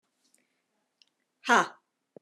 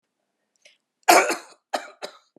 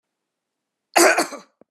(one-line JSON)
{"exhalation_length": "2.2 s", "exhalation_amplitude": 14240, "exhalation_signal_mean_std_ratio": 0.21, "three_cough_length": "2.4 s", "three_cough_amplitude": 25875, "three_cough_signal_mean_std_ratio": 0.28, "cough_length": "1.7 s", "cough_amplitude": 30923, "cough_signal_mean_std_ratio": 0.33, "survey_phase": "beta (2021-08-13 to 2022-03-07)", "age": "45-64", "gender": "Female", "wearing_mask": "No", "symptom_none": true, "smoker_status": "Never smoked", "respiratory_condition_asthma": false, "respiratory_condition_other": false, "recruitment_source": "REACT", "submission_delay": "2 days", "covid_test_result": "Negative", "covid_test_method": "RT-qPCR", "covid_ct_value": 38.0, "covid_ct_gene": "N gene"}